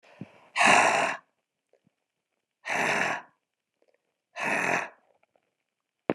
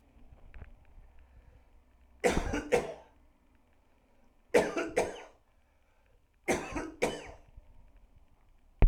{"exhalation_length": "6.1 s", "exhalation_amplitude": 18135, "exhalation_signal_mean_std_ratio": 0.39, "three_cough_length": "8.9 s", "three_cough_amplitude": 11684, "three_cough_signal_mean_std_ratio": 0.32, "survey_phase": "alpha (2021-03-01 to 2021-08-12)", "age": "45-64", "gender": "Male", "wearing_mask": "No", "symptom_none": true, "smoker_status": "Never smoked", "respiratory_condition_asthma": false, "respiratory_condition_other": false, "recruitment_source": "REACT", "submission_delay": "1 day", "covid_test_result": "Negative", "covid_test_method": "RT-qPCR"}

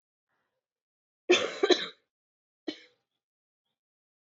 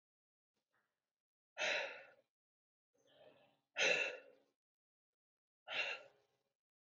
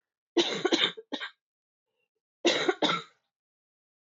{"three_cough_length": "4.3 s", "three_cough_amplitude": 14334, "three_cough_signal_mean_std_ratio": 0.23, "exhalation_length": "7.0 s", "exhalation_amplitude": 2563, "exhalation_signal_mean_std_ratio": 0.3, "cough_length": "4.1 s", "cough_amplitude": 10430, "cough_signal_mean_std_ratio": 0.39, "survey_phase": "alpha (2021-03-01 to 2021-08-12)", "age": "18-44", "gender": "Female", "wearing_mask": "No", "symptom_cough_any": true, "symptom_change_to_sense_of_smell_or_taste": true, "symptom_onset": "3 days", "smoker_status": "Never smoked", "respiratory_condition_asthma": false, "respiratory_condition_other": false, "recruitment_source": "Test and Trace", "submission_delay": "1 day", "covid_test_result": "Positive", "covid_test_method": "RT-qPCR"}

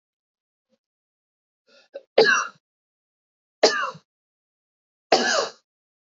{"three_cough_length": "6.1 s", "three_cough_amplitude": 26929, "three_cough_signal_mean_std_ratio": 0.28, "survey_phase": "beta (2021-08-13 to 2022-03-07)", "age": "45-64", "gender": "Female", "wearing_mask": "No", "symptom_none": true, "symptom_onset": "11 days", "smoker_status": "Never smoked", "respiratory_condition_asthma": false, "respiratory_condition_other": false, "recruitment_source": "REACT", "submission_delay": "2 days", "covid_test_result": "Negative", "covid_test_method": "RT-qPCR", "influenza_a_test_result": "Negative", "influenza_b_test_result": "Negative"}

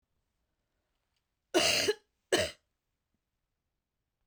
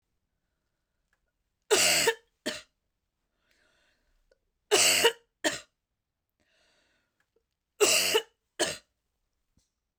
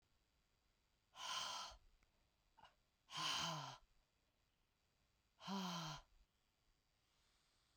{"cough_length": "4.3 s", "cough_amplitude": 6462, "cough_signal_mean_std_ratio": 0.29, "three_cough_length": "10.0 s", "three_cough_amplitude": 12895, "three_cough_signal_mean_std_ratio": 0.31, "exhalation_length": "7.8 s", "exhalation_amplitude": 815, "exhalation_signal_mean_std_ratio": 0.42, "survey_phase": "beta (2021-08-13 to 2022-03-07)", "age": "45-64", "gender": "Female", "wearing_mask": "No", "symptom_cough_any": true, "symptom_sore_throat": true, "smoker_status": "Never smoked", "respiratory_condition_asthma": false, "respiratory_condition_other": false, "recruitment_source": "REACT", "submission_delay": "0 days", "covid_test_result": "Negative", "covid_test_method": "RT-qPCR"}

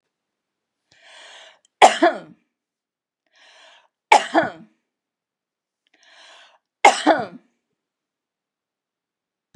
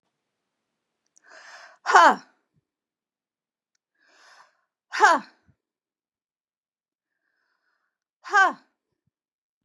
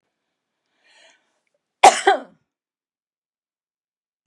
{"three_cough_length": "9.6 s", "three_cough_amplitude": 32768, "three_cough_signal_mean_std_ratio": 0.22, "exhalation_length": "9.6 s", "exhalation_amplitude": 28206, "exhalation_signal_mean_std_ratio": 0.2, "cough_length": "4.3 s", "cough_amplitude": 32768, "cough_signal_mean_std_ratio": 0.17, "survey_phase": "beta (2021-08-13 to 2022-03-07)", "age": "45-64", "gender": "Female", "wearing_mask": "No", "symptom_none": true, "smoker_status": "Ex-smoker", "respiratory_condition_asthma": false, "respiratory_condition_other": false, "recruitment_source": "REACT", "submission_delay": "3 days", "covid_test_result": "Negative", "covid_test_method": "RT-qPCR", "influenza_a_test_result": "Negative", "influenza_b_test_result": "Negative"}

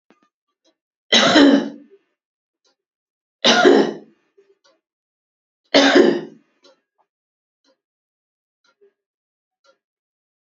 {"three_cough_length": "10.5 s", "three_cough_amplitude": 31538, "three_cough_signal_mean_std_ratio": 0.3, "survey_phase": "beta (2021-08-13 to 2022-03-07)", "age": "18-44", "gender": "Female", "wearing_mask": "No", "symptom_none": true, "smoker_status": "Never smoked", "respiratory_condition_asthma": true, "respiratory_condition_other": false, "recruitment_source": "REACT", "submission_delay": "7 days", "covid_test_result": "Negative", "covid_test_method": "RT-qPCR", "influenza_a_test_result": "Negative", "influenza_b_test_result": "Negative"}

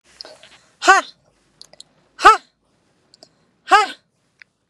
{"exhalation_length": "4.7 s", "exhalation_amplitude": 32768, "exhalation_signal_mean_std_ratio": 0.25, "survey_phase": "beta (2021-08-13 to 2022-03-07)", "age": "45-64", "gender": "Female", "wearing_mask": "No", "symptom_none": true, "smoker_status": "Never smoked", "respiratory_condition_asthma": false, "respiratory_condition_other": false, "recruitment_source": "REACT", "submission_delay": "5 days", "covid_test_result": "Negative", "covid_test_method": "RT-qPCR", "influenza_a_test_result": "Negative", "influenza_b_test_result": "Negative"}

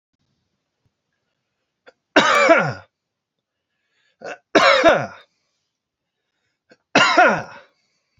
{"three_cough_length": "8.2 s", "three_cough_amplitude": 28493, "three_cough_signal_mean_std_ratio": 0.35, "survey_phase": "beta (2021-08-13 to 2022-03-07)", "age": "18-44", "gender": "Male", "wearing_mask": "No", "symptom_none": true, "symptom_onset": "4 days", "smoker_status": "Never smoked", "respiratory_condition_asthma": false, "respiratory_condition_other": false, "recruitment_source": "REACT", "submission_delay": "2 days", "covid_test_result": "Negative", "covid_test_method": "RT-qPCR", "influenza_a_test_result": "Negative", "influenza_b_test_result": "Negative"}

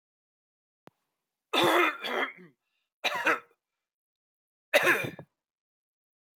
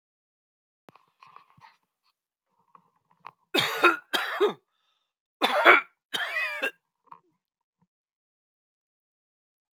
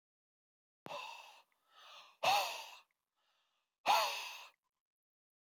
{"three_cough_length": "6.4 s", "three_cough_amplitude": 12471, "three_cough_signal_mean_std_ratio": 0.35, "cough_length": "9.7 s", "cough_amplitude": 26714, "cough_signal_mean_std_ratio": 0.27, "exhalation_length": "5.5 s", "exhalation_amplitude": 3881, "exhalation_signal_mean_std_ratio": 0.33, "survey_phase": "alpha (2021-03-01 to 2021-08-12)", "age": "45-64", "gender": "Male", "wearing_mask": "No", "symptom_none": true, "smoker_status": "Ex-smoker", "respiratory_condition_asthma": false, "respiratory_condition_other": false, "recruitment_source": "REACT", "submission_delay": "1 day", "covid_test_result": "Negative", "covid_test_method": "RT-qPCR"}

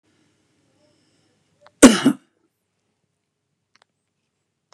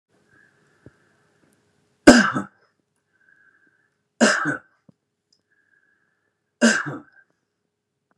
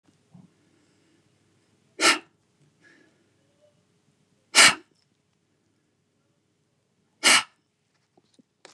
{"cough_length": "4.7 s", "cough_amplitude": 32768, "cough_signal_mean_std_ratio": 0.16, "three_cough_length": "8.2 s", "three_cough_amplitude": 32768, "three_cough_signal_mean_std_ratio": 0.23, "exhalation_length": "8.7 s", "exhalation_amplitude": 27981, "exhalation_signal_mean_std_ratio": 0.19, "survey_phase": "beta (2021-08-13 to 2022-03-07)", "age": "65+", "gender": "Male", "wearing_mask": "No", "symptom_none": true, "smoker_status": "Never smoked", "respiratory_condition_asthma": false, "respiratory_condition_other": false, "recruitment_source": "REACT", "submission_delay": "1 day", "covid_test_result": "Negative", "covid_test_method": "RT-qPCR", "influenza_a_test_result": "Negative", "influenza_b_test_result": "Negative"}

